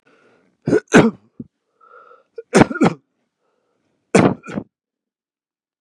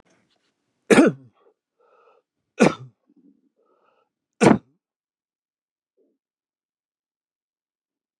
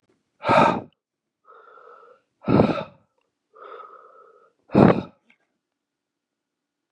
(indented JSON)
{
  "cough_length": "5.8 s",
  "cough_amplitude": 32768,
  "cough_signal_mean_std_ratio": 0.29,
  "three_cough_length": "8.2 s",
  "three_cough_amplitude": 29369,
  "three_cough_signal_mean_std_ratio": 0.19,
  "exhalation_length": "6.9 s",
  "exhalation_amplitude": 32768,
  "exhalation_signal_mean_std_ratio": 0.29,
  "survey_phase": "beta (2021-08-13 to 2022-03-07)",
  "age": "45-64",
  "gender": "Male",
  "wearing_mask": "No",
  "symptom_cough_any": true,
  "symptom_runny_or_blocked_nose": true,
  "symptom_fatigue": true,
  "symptom_headache": true,
  "smoker_status": "Never smoked",
  "respiratory_condition_asthma": false,
  "respiratory_condition_other": false,
  "recruitment_source": "Test and Trace",
  "submission_delay": "1 day",
  "covid_test_result": "Positive",
  "covid_test_method": "RT-qPCR",
  "covid_ct_value": 23.3,
  "covid_ct_gene": "ORF1ab gene"
}